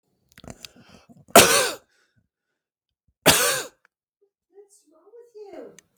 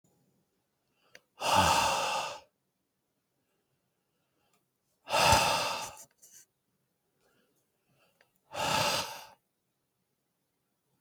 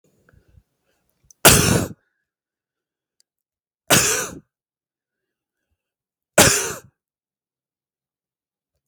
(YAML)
cough_length: 6.0 s
cough_amplitude: 32768
cough_signal_mean_std_ratio: 0.26
exhalation_length: 11.0 s
exhalation_amplitude: 10967
exhalation_signal_mean_std_ratio: 0.36
three_cough_length: 8.9 s
three_cough_amplitude: 32768
three_cough_signal_mean_std_ratio: 0.26
survey_phase: beta (2021-08-13 to 2022-03-07)
age: 45-64
gender: Male
wearing_mask: 'No'
symptom_none: true
smoker_status: Ex-smoker
respiratory_condition_asthma: false
respiratory_condition_other: false
recruitment_source: REACT
submission_delay: 2 days
covid_test_result: Negative
covid_test_method: RT-qPCR
influenza_a_test_result: Negative
influenza_b_test_result: Negative